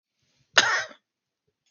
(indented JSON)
{
  "cough_length": "1.7 s",
  "cough_amplitude": 32768,
  "cough_signal_mean_std_ratio": 0.27,
  "survey_phase": "beta (2021-08-13 to 2022-03-07)",
  "age": "18-44",
  "gender": "Male",
  "wearing_mask": "No",
  "symptom_cough_any": true,
  "symptom_sore_throat": true,
  "symptom_onset": "3 days",
  "smoker_status": "Never smoked",
  "respiratory_condition_asthma": false,
  "respiratory_condition_other": false,
  "recruitment_source": "Test and Trace",
  "submission_delay": "0 days",
  "covid_test_result": "Positive",
  "covid_test_method": "RT-qPCR",
  "covid_ct_value": 26.1,
  "covid_ct_gene": "N gene"
}